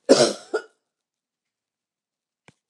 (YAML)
cough_length: 2.7 s
cough_amplitude: 28737
cough_signal_mean_std_ratio: 0.24
survey_phase: beta (2021-08-13 to 2022-03-07)
age: 65+
gender: Female
wearing_mask: 'No'
symptom_none: true
smoker_status: Never smoked
respiratory_condition_asthma: false
respiratory_condition_other: false
recruitment_source: REACT
submission_delay: 0 days
covid_test_result: Negative
covid_test_method: RT-qPCR